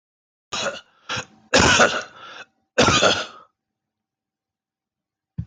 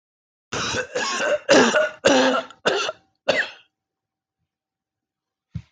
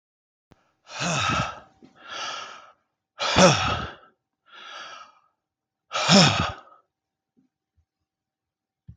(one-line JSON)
{"three_cough_length": "5.5 s", "three_cough_amplitude": 24524, "three_cough_signal_mean_std_ratio": 0.38, "cough_length": "5.7 s", "cough_amplitude": 17781, "cough_signal_mean_std_ratio": 0.48, "exhalation_length": "9.0 s", "exhalation_amplitude": 22999, "exhalation_signal_mean_std_ratio": 0.35, "survey_phase": "alpha (2021-03-01 to 2021-08-12)", "age": "45-64", "gender": "Male", "wearing_mask": "No", "symptom_change_to_sense_of_smell_or_taste": true, "symptom_loss_of_taste": true, "symptom_onset": "3 days", "smoker_status": "Never smoked", "respiratory_condition_asthma": false, "respiratory_condition_other": false, "recruitment_source": "Test and Trace", "submission_delay": "2 days", "covid_test_result": "Positive", "covid_test_method": "RT-qPCR", "covid_ct_value": 29.9, "covid_ct_gene": "ORF1ab gene", "covid_ct_mean": 30.7, "covid_viral_load": "84 copies/ml", "covid_viral_load_category": "Minimal viral load (< 10K copies/ml)"}